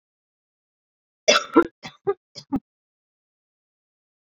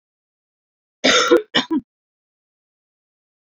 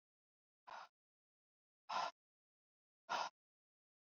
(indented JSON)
{
  "three_cough_length": "4.4 s",
  "three_cough_amplitude": 26826,
  "three_cough_signal_mean_std_ratio": 0.21,
  "cough_length": "3.4 s",
  "cough_amplitude": 27301,
  "cough_signal_mean_std_ratio": 0.31,
  "exhalation_length": "4.1 s",
  "exhalation_amplitude": 1058,
  "exhalation_signal_mean_std_ratio": 0.26,
  "survey_phase": "alpha (2021-03-01 to 2021-08-12)",
  "age": "18-44",
  "gender": "Female",
  "wearing_mask": "No",
  "symptom_cough_any": true,
  "symptom_change_to_sense_of_smell_or_taste": true,
  "symptom_onset": "6 days",
  "smoker_status": "Never smoked",
  "respiratory_condition_asthma": false,
  "respiratory_condition_other": false,
  "recruitment_source": "Test and Trace",
  "submission_delay": "2 days",
  "covid_test_result": "Positive",
  "covid_test_method": "RT-qPCR"
}